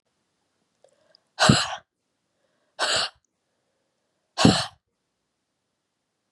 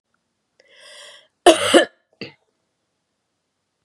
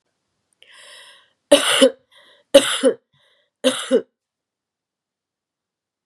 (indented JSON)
{
  "exhalation_length": "6.3 s",
  "exhalation_amplitude": 30321,
  "exhalation_signal_mean_std_ratio": 0.26,
  "cough_length": "3.8 s",
  "cough_amplitude": 32767,
  "cough_signal_mean_std_ratio": 0.22,
  "three_cough_length": "6.1 s",
  "three_cough_amplitude": 32767,
  "three_cough_signal_mean_std_ratio": 0.29,
  "survey_phase": "beta (2021-08-13 to 2022-03-07)",
  "age": "45-64",
  "gender": "Female",
  "wearing_mask": "No",
  "symptom_cough_any": true,
  "symptom_sore_throat": true,
  "symptom_headache": true,
  "symptom_other": true,
  "symptom_onset": "4 days",
  "smoker_status": "Never smoked",
  "respiratory_condition_asthma": false,
  "respiratory_condition_other": false,
  "recruitment_source": "Test and Trace",
  "submission_delay": "2 days",
  "covid_test_result": "Positive",
  "covid_test_method": "RT-qPCR",
  "covid_ct_value": 18.1,
  "covid_ct_gene": "ORF1ab gene",
  "covid_ct_mean": 18.3,
  "covid_viral_load": "970000 copies/ml",
  "covid_viral_load_category": "Low viral load (10K-1M copies/ml)"
}